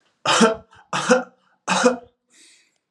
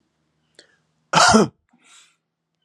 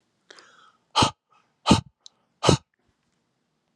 {
  "three_cough_length": "2.9 s",
  "three_cough_amplitude": 31170,
  "three_cough_signal_mean_std_ratio": 0.43,
  "cough_length": "2.6 s",
  "cough_amplitude": 32223,
  "cough_signal_mean_std_ratio": 0.29,
  "exhalation_length": "3.8 s",
  "exhalation_amplitude": 28424,
  "exhalation_signal_mean_std_ratio": 0.25,
  "survey_phase": "alpha (2021-03-01 to 2021-08-12)",
  "age": "45-64",
  "gender": "Male",
  "wearing_mask": "No",
  "symptom_cough_any": true,
  "symptom_headache": true,
  "symptom_change_to_sense_of_smell_or_taste": true,
  "smoker_status": "Never smoked",
  "respiratory_condition_asthma": false,
  "respiratory_condition_other": false,
  "recruitment_source": "Test and Trace",
  "submission_delay": "1 day",
  "covid_test_result": "Positive",
  "covid_test_method": "RT-qPCR",
  "covid_ct_value": 22.3,
  "covid_ct_gene": "ORF1ab gene",
  "covid_ct_mean": 22.9,
  "covid_viral_load": "30000 copies/ml",
  "covid_viral_load_category": "Low viral load (10K-1M copies/ml)"
}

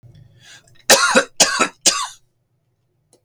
{
  "cough_length": "3.2 s",
  "cough_amplitude": 32768,
  "cough_signal_mean_std_ratio": 0.38,
  "survey_phase": "beta (2021-08-13 to 2022-03-07)",
  "age": "45-64",
  "gender": "Male",
  "wearing_mask": "No",
  "symptom_none": true,
  "smoker_status": "Never smoked",
  "respiratory_condition_asthma": false,
  "respiratory_condition_other": false,
  "recruitment_source": "REACT",
  "submission_delay": "2 days",
  "covid_test_result": "Negative",
  "covid_test_method": "RT-qPCR",
  "influenza_a_test_result": "Negative",
  "influenza_b_test_result": "Negative"
}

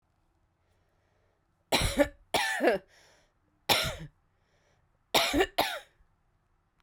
{
  "three_cough_length": "6.8 s",
  "three_cough_amplitude": 11926,
  "three_cough_signal_mean_std_ratio": 0.37,
  "survey_phase": "beta (2021-08-13 to 2022-03-07)",
  "age": "45-64",
  "gender": "Female",
  "wearing_mask": "No",
  "symptom_cough_any": true,
  "symptom_runny_or_blocked_nose": true,
  "symptom_sore_throat": true,
  "symptom_fatigue": true,
  "symptom_headache": true,
  "symptom_change_to_sense_of_smell_or_taste": true,
  "symptom_onset": "4 days",
  "smoker_status": "Never smoked",
  "respiratory_condition_asthma": false,
  "respiratory_condition_other": false,
  "recruitment_source": "Test and Trace",
  "submission_delay": "2 days",
  "covid_test_result": "Positive",
  "covid_test_method": "RT-qPCR",
  "covid_ct_value": 22.2,
  "covid_ct_gene": "ORF1ab gene"
}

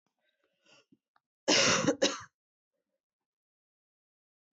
{
  "cough_length": "4.5 s",
  "cough_amplitude": 7915,
  "cough_signal_mean_std_ratio": 0.29,
  "survey_phase": "alpha (2021-03-01 to 2021-08-12)",
  "age": "18-44",
  "gender": "Female",
  "wearing_mask": "No",
  "symptom_headache": true,
  "smoker_status": "Ex-smoker",
  "respiratory_condition_asthma": false,
  "respiratory_condition_other": false,
  "recruitment_source": "Test and Trace",
  "submission_delay": "1 day",
  "covid_test_result": "Positive",
  "covid_test_method": "RT-qPCR"
}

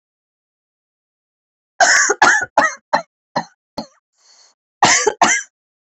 {
  "cough_length": "5.8 s",
  "cough_amplitude": 30903,
  "cough_signal_mean_std_ratio": 0.39,
  "survey_phase": "beta (2021-08-13 to 2022-03-07)",
  "age": "45-64",
  "gender": "Female",
  "wearing_mask": "No",
  "symptom_cough_any": true,
  "symptom_runny_or_blocked_nose": true,
  "symptom_sore_throat": true,
  "symptom_headache": true,
  "smoker_status": "Never smoked",
  "respiratory_condition_asthma": false,
  "respiratory_condition_other": false,
  "recruitment_source": "Test and Trace",
  "submission_delay": "1 day",
  "covid_test_result": "Positive",
  "covid_test_method": "RT-qPCR",
  "covid_ct_value": 32.4,
  "covid_ct_gene": "N gene"
}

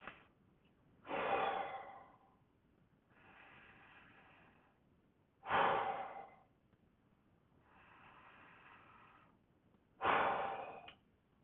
{
  "exhalation_length": "11.4 s",
  "exhalation_amplitude": 2868,
  "exhalation_signal_mean_std_ratio": 0.38,
  "survey_phase": "beta (2021-08-13 to 2022-03-07)",
  "age": "65+",
  "gender": "Male",
  "wearing_mask": "No",
  "symptom_none": true,
  "smoker_status": "Ex-smoker",
  "respiratory_condition_asthma": false,
  "respiratory_condition_other": false,
  "recruitment_source": "REACT",
  "submission_delay": "6 days",
  "covid_test_result": "Negative",
  "covid_test_method": "RT-qPCR"
}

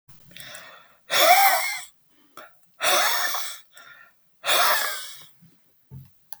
{
  "exhalation_length": "6.4 s",
  "exhalation_amplitude": 20695,
  "exhalation_signal_mean_std_ratio": 0.47,
  "survey_phase": "beta (2021-08-13 to 2022-03-07)",
  "age": "65+",
  "gender": "Male",
  "wearing_mask": "No",
  "symptom_none": true,
  "smoker_status": "Never smoked",
  "respiratory_condition_asthma": false,
  "respiratory_condition_other": false,
  "recruitment_source": "REACT",
  "submission_delay": "1 day",
  "covid_test_result": "Negative",
  "covid_test_method": "RT-qPCR"
}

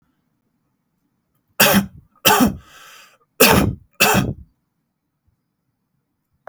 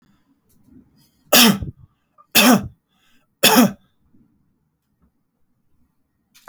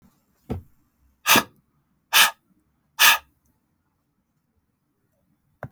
{
  "cough_length": "6.5 s",
  "cough_amplitude": 32768,
  "cough_signal_mean_std_ratio": 0.35,
  "three_cough_length": "6.5 s",
  "three_cough_amplitude": 32768,
  "three_cough_signal_mean_std_ratio": 0.29,
  "exhalation_length": "5.7 s",
  "exhalation_amplitude": 29439,
  "exhalation_signal_mean_std_ratio": 0.24,
  "survey_phase": "alpha (2021-03-01 to 2021-08-12)",
  "age": "18-44",
  "gender": "Male",
  "wearing_mask": "No",
  "symptom_none": true,
  "smoker_status": "Never smoked",
  "respiratory_condition_asthma": false,
  "respiratory_condition_other": false,
  "recruitment_source": "REACT",
  "submission_delay": "1 day",
  "covid_test_result": "Negative",
  "covid_test_method": "RT-qPCR"
}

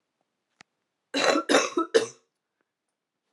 {
  "cough_length": "3.3 s",
  "cough_amplitude": 20072,
  "cough_signal_mean_std_ratio": 0.34,
  "survey_phase": "alpha (2021-03-01 to 2021-08-12)",
  "age": "18-44",
  "gender": "Female",
  "wearing_mask": "No",
  "symptom_cough_any": true,
  "symptom_new_continuous_cough": true,
  "symptom_shortness_of_breath": true,
  "symptom_headache": true,
  "symptom_change_to_sense_of_smell_or_taste": true,
  "symptom_loss_of_taste": true,
  "symptom_onset": "4 days",
  "smoker_status": "Never smoked",
  "respiratory_condition_asthma": false,
  "respiratory_condition_other": false,
  "recruitment_source": "Test and Trace",
  "submission_delay": "2 days",
  "covid_test_result": "Positive",
  "covid_test_method": "RT-qPCR"
}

